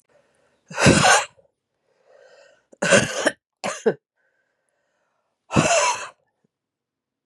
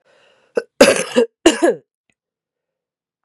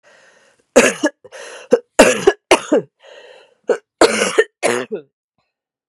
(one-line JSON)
{"exhalation_length": "7.3 s", "exhalation_amplitude": 29047, "exhalation_signal_mean_std_ratio": 0.35, "cough_length": "3.2 s", "cough_amplitude": 32768, "cough_signal_mean_std_ratio": 0.32, "three_cough_length": "5.9 s", "three_cough_amplitude": 32768, "three_cough_signal_mean_std_ratio": 0.38, "survey_phase": "beta (2021-08-13 to 2022-03-07)", "age": "45-64", "gender": "Female", "wearing_mask": "No", "symptom_cough_any": true, "symptom_new_continuous_cough": true, "symptom_runny_or_blocked_nose": true, "symptom_shortness_of_breath": true, "symptom_sore_throat": true, "symptom_abdominal_pain": true, "symptom_fatigue": true, "symptom_fever_high_temperature": true, "symptom_headache": true, "symptom_change_to_sense_of_smell_or_taste": true, "symptom_loss_of_taste": true, "smoker_status": "Ex-smoker", "respiratory_condition_asthma": false, "respiratory_condition_other": false, "recruitment_source": "Test and Trace", "submission_delay": "2 days", "covid_test_result": "Negative", "covid_test_method": "LFT"}